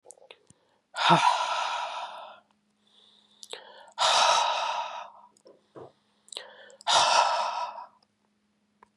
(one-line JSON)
{"exhalation_length": "9.0 s", "exhalation_amplitude": 14992, "exhalation_signal_mean_std_ratio": 0.47, "survey_phase": "beta (2021-08-13 to 2022-03-07)", "age": "45-64", "gender": "Female", "wearing_mask": "No", "symptom_cough_any": true, "symptom_runny_or_blocked_nose": true, "symptom_sore_throat": true, "symptom_headache": true, "symptom_change_to_sense_of_smell_or_taste": true, "symptom_loss_of_taste": true, "symptom_other": true, "symptom_onset": "4 days", "smoker_status": "Ex-smoker", "respiratory_condition_asthma": false, "respiratory_condition_other": false, "recruitment_source": "Test and Trace", "submission_delay": "2 days", "covid_test_result": "Positive", "covid_test_method": "RT-qPCR", "covid_ct_value": 17.4, "covid_ct_gene": "ORF1ab gene", "covid_ct_mean": 18.7, "covid_viral_load": "740000 copies/ml", "covid_viral_load_category": "Low viral load (10K-1M copies/ml)"}